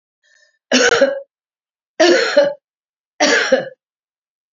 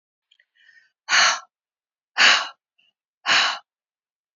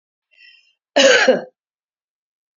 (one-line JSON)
{"three_cough_length": "4.5 s", "three_cough_amplitude": 32768, "three_cough_signal_mean_std_ratio": 0.46, "exhalation_length": "4.4 s", "exhalation_amplitude": 24295, "exhalation_signal_mean_std_ratio": 0.35, "cough_length": "2.6 s", "cough_amplitude": 30930, "cough_signal_mean_std_ratio": 0.34, "survey_phase": "beta (2021-08-13 to 2022-03-07)", "age": "65+", "gender": "Female", "wearing_mask": "No", "symptom_none": true, "smoker_status": "Ex-smoker", "respiratory_condition_asthma": false, "respiratory_condition_other": false, "recruitment_source": "REACT", "submission_delay": "0 days", "covid_test_result": "Negative", "covid_test_method": "RT-qPCR", "influenza_a_test_result": "Negative", "influenza_b_test_result": "Negative"}